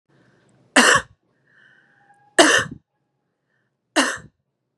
three_cough_length: 4.8 s
three_cough_amplitude: 32651
three_cough_signal_mean_std_ratio: 0.3
survey_phase: beta (2021-08-13 to 2022-03-07)
age: 45-64
gender: Female
wearing_mask: 'No'
symptom_none: true
smoker_status: Never smoked
respiratory_condition_asthma: false
respiratory_condition_other: false
recruitment_source: REACT
submission_delay: 0 days
covid_test_result: Negative
covid_test_method: RT-qPCR
influenza_a_test_result: Negative
influenza_b_test_result: Negative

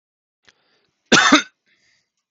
cough_length: 2.3 s
cough_amplitude: 30247
cough_signal_mean_std_ratio: 0.28
survey_phase: beta (2021-08-13 to 2022-03-07)
age: 45-64
gender: Male
wearing_mask: 'No'
symptom_none: true
smoker_status: Never smoked
respiratory_condition_asthma: false
respiratory_condition_other: false
recruitment_source: REACT
submission_delay: 2 days
covid_test_result: Negative
covid_test_method: RT-qPCR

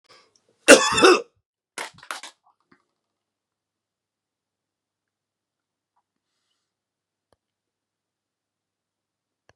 cough_length: 9.6 s
cough_amplitude: 32768
cough_signal_mean_std_ratio: 0.16
survey_phase: beta (2021-08-13 to 2022-03-07)
age: 45-64
gender: Male
wearing_mask: 'No'
symptom_none: true
smoker_status: Current smoker (11 or more cigarettes per day)
respiratory_condition_asthma: false
respiratory_condition_other: false
recruitment_source: Test and Trace
submission_delay: 2 days
covid_test_result: Positive
covid_test_method: ePCR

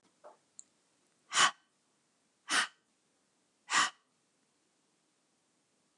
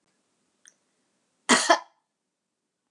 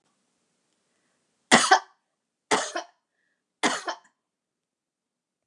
exhalation_length: 6.0 s
exhalation_amplitude: 8937
exhalation_signal_mean_std_ratio: 0.24
cough_length: 2.9 s
cough_amplitude: 20496
cough_signal_mean_std_ratio: 0.22
three_cough_length: 5.5 s
three_cough_amplitude: 32422
three_cough_signal_mean_std_ratio: 0.24
survey_phase: beta (2021-08-13 to 2022-03-07)
age: 65+
gender: Female
wearing_mask: 'No'
symptom_none: true
smoker_status: Never smoked
respiratory_condition_asthma: false
respiratory_condition_other: false
recruitment_source: REACT
submission_delay: 1 day
covid_test_result: Negative
covid_test_method: RT-qPCR
influenza_a_test_result: Negative
influenza_b_test_result: Negative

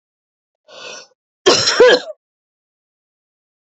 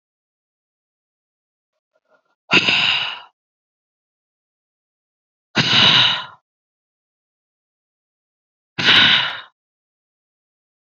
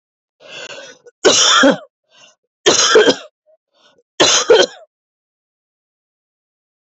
cough_length: 3.8 s
cough_amplitude: 32768
cough_signal_mean_std_ratio: 0.3
exhalation_length: 10.9 s
exhalation_amplitude: 29828
exhalation_signal_mean_std_ratio: 0.31
three_cough_length: 7.0 s
three_cough_amplitude: 32743
three_cough_signal_mean_std_ratio: 0.39
survey_phase: beta (2021-08-13 to 2022-03-07)
age: 18-44
gender: Female
wearing_mask: 'No'
symptom_cough_any: true
symptom_shortness_of_breath: true
symptom_sore_throat: true
symptom_diarrhoea: true
symptom_other: true
smoker_status: Never smoked
respiratory_condition_asthma: false
respiratory_condition_other: false
recruitment_source: Test and Trace
submission_delay: 3 days
covid_test_result: Positive
covid_test_method: LFT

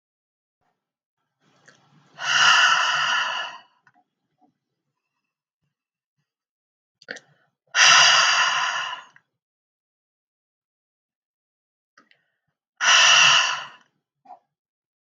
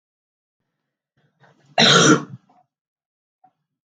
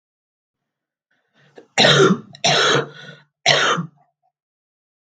exhalation_length: 15.1 s
exhalation_amplitude: 31844
exhalation_signal_mean_std_ratio: 0.36
cough_length: 3.8 s
cough_amplitude: 32436
cough_signal_mean_std_ratio: 0.28
three_cough_length: 5.1 s
three_cough_amplitude: 32768
three_cough_signal_mean_std_ratio: 0.4
survey_phase: beta (2021-08-13 to 2022-03-07)
age: 45-64
gender: Female
wearing_mask: 'No'
symptom_cough_any: true
symptom_onset: 7 days
smoker_status: Never smoked
respiratory_condition_asthma: false
respiratory_condition_other: false
recruitment_source: REACT
submission_delay: 1 day
covid_test_result: Negative
covid_test_method: RT-qPCR
influenza_a_test_result: Negative
influenza_b_test_result: Negative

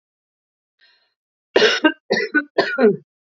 three_cough_length: 3.3 s
three_cough_amplitude: 28093
three_cough_signal_mean_std_ratio: 0.4
survey_phase: alpha (2021-03-01 to 2021-08-12)
age: 18-44
gender: Female
wearing_mask: 'No'
symptom_none: true
symptom_onset: 5 days
smoker_status: Ex-smoker
respiratory_condition_asthma: false
respiratory_condition_other: false
recruitment_source: REACT
submission_delay: 1 day
covid_test_result: Negative
covid_test_method: RT-qPCR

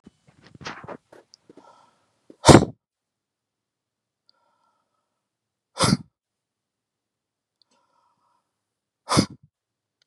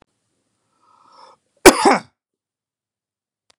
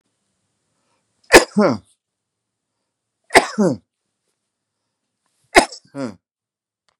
exhalation_length: 10.1 s
exhalation_amplitude: 32768
exhalation_signal_mean_std_ratio: 0.16
cough_length: 3.6 s
cough_amplitude: 32768
cough_signal_mean_std_ratio: 0.19
three_cough_length: 7.0 s
three_cough_amplitude: 32768
three_cough_signal_mean_std_ratio: 0.23
survey_phase: beta (2021-08-13 to 2022-03-07)
age: 45-64
gender: Male
wearing_mask: 'No'
symptom_none: true
smoker_status: Ex-smoker
respiratory_condition_asthma: false
respiratory_condition_other: false
recruitment_source: REACT
submission_delay: 1 day
covid_test_result: Negative
covid_test_method: RT-qPCR
influenza_a_test_result: Negative
influenza_b_test_result: Negative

